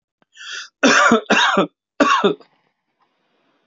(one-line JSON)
{"cough_length": "3.7 s", "cough_amplitude": 32767, "cough_signal_mean_std_ratio": 0.46, "survey_phase": "alpha (2021-03-01 to 2021-08-12)", "age": "65+", "gender": "Male", "wearing_mask": "No", "symptom_none": true, "smoker_status": "Ex-smoker", "respiratory_condition_asthma": false, "respiratory_condition_other": true, "recruitment_source": "REACT", "submission_delay": "2 days", "covid_test_result": "Negative", "covid_test_method": "RT-qPCR"}